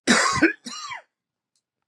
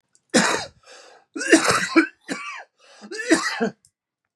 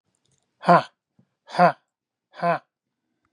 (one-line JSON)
{"cough_length": "1.9 s", "cough_amplitude": 20970, "cough_signal_mean_std_ratio": 0.43, "three_cough_length": "4.4 s", "three_cough_amplitude": 27477, "three_cough_signal_mean_std_ratio": 0.45, "exhalation_length": "3.3 s", "exhalation_amplitude": 25792, "exhalation_signal_mean_std_ratio": 0.27, "survey_phase": "beta (2021-08-13 to 2022-03-07)", "age": "45-64", "gender": "Female", "wearing_mask": "No", "symptom_none": true, "symptom_onset": "5 days", "smoker_status": "Ex-smoker", "respiratory_condition_asthma": false, "respiratory_condition_other": false, "recruitment_source": "Test and Trace", "submission_delay": "3 days", "covid_test_result": "Positive", "covid_test_method": "RT-qPCR", "covid_ct_value": 19.4, "covid_ct_gene": "ORF1ab gene", "covid_ct_mean": 20.0, "covid_viral_load": "280000 copies/ml", "covid_viral_load_category": "Low viral load (10K-1M copies/ml)"}